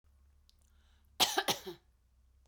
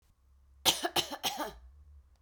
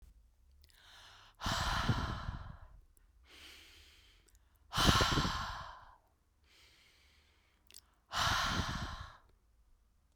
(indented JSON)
{
  "cough_length": "2.5 s",
  "cough_amplitude": 7069,
  "cough_signal_mean_std_ratio": 0.29,
  "three_cough_length": "2.2 s",
  "three_cough_amplitude": 10657,
  "three_cough_signal_mean_std_ratio": 0.4,
  "exhalation_length": "10.2 s",
  "exhalation_amplitude": 7691,
  "exhalation_signal_mean_std_ratio": 0.43,
  "survey_phase": "beta (2021-08-13 to 2022-03-07)",
  "age": "45-64",
  "gender": "Female",
  "wearing_mask": "No",
  "symptom_fatigue": true,
  "symptom_onset": "12 days",
  "smoker_status": "Never smoked",
  "respiratory_condition_asthma": true,
  "respiratory_condition_other": false,
  "recruitment_source": "REACT",
  "submission_delay": "1 day",
  "covid_test_result": "Negative",
  "covid_test_method": "RT-qPCR"
}